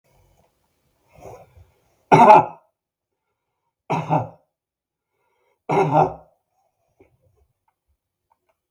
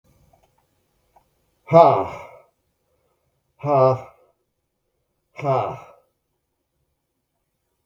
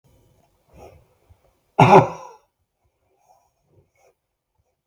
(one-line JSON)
{"three_cough_length": "8.7 s", "three_cough_amplitude": 32768, "three_cough_signal_mean_std_ratio": 0.25, "exhalation_length": "7.9 s", "exhalation_amplitude": 32768, "exhalation_signal_mean_std_ratio": 0.26, "cough_length": "4.9 s", "cough_amplitude": 32766, "cough_signal_mean_std_ratio": 0.2, "survey_phase": "beta (2021-08-13 to 2022-03-07)", "age": "45-64", "gender": "Male", "wearing_mask": "No", "symptom_none": true, "smoker_status": "Never smoked", "respiratory_condition_asthma": false, "respiratory_condition_other": false, "recruitment_source": "REACT", "submission_delay": "3 days", "covid_test_result": "Negative", "covid_test_method": "RT-qPCR"}